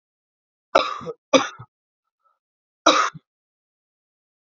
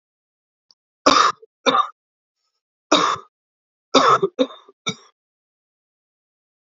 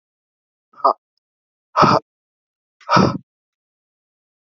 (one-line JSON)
{"cough_length": "4.5 s", "cough_amplitude": 28088, "cough_signal_mean_std_ratio": 0.25, "three_cough_length": "6.7 s", "three_cough_amplitude": 28435, "three_cough_signal_mean_std_ratio": 0.32, "exhalation_length": "4.4 s", "exhalation_amplitude": 29232, "exhalation_signal_mean_std_ratio": 0.28, "survey_phase": "alpha (2021-03-01 to 2021-08-12)", "age": "18-44", "gender": "Male", "wearing_mask": "No", "symptom_cough_any": true, "symptom_shortness_of_breath": true, "symptom_headache": true, "symptom_change_to_sense_of_smell_or_taste": true, "symptom_onset": "4 days", "smoker_status": "Ex-smoker", "respiratory_condition_asthma": false, "respiratory_condition_other": false, "recruitment_source": "Test and Trace", "submission_delay": "3 days", "covid_test_result": "Positive", "covid_test_method": "RT-qPCR", "covid_ct_value": 23.9, "covid_ct_gene": "S gene", "covid_ct_mean": 24.3, "covid_viral_load": "11000 copies/ml", "covid_viral_load_category": "Low viral load (10K-1M copies/ml)"}